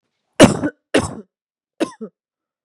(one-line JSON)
{"cough_length": "2.6 s", "cough_amplitude": 32768, "cough_signal_mean_std_ratio": 0.28, "survey_phase": "beta (2021-08-13 to 2022-03-07)", "age": "18-44", "gender": "Female", "wearing_mask": "No", "symptom_cough_any": true, "symptom_headache": true, "smoker_status": "Never smoked", "respiratory_condition_asthma": false, "respiratory_condition_other": false, "recruitment_source": "Test and Trace", "submission_delay": "2 days", "covid_test_result": "Positive", "covid_test_method": "ePCR"}